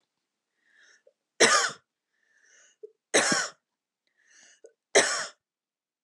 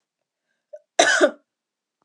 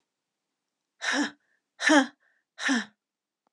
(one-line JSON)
{"three_cough_length": "6.0 s", "three_cough_amplitude": 19185, "three_cough_signal_mean_std_ratio": 0.29, "cough_length": "2.0 s", "cough_amplitude": 29151, "cough_signal_mean_std_ratio": 0.3, "exhalation_length": "3.5 s", "exhalation_amplitude": 15323, "exhalation_signal_mean_std_ratio": 0.34, "survey_phase": "alpha (2021-03-01 to 2021-08-12)", "age": "18-44", "gender": "Female", "wearing_mask": "No", "symptom_headache": true, "smoker_status": "Never smoked", "respiratory_condition_asthma": false, "respiratory_condition_other": false, "recruitment_source": "REACT", "submission_delay": "1 day", "covid_test_result": "Negative", "covid_test_method": "RT-qPCR"}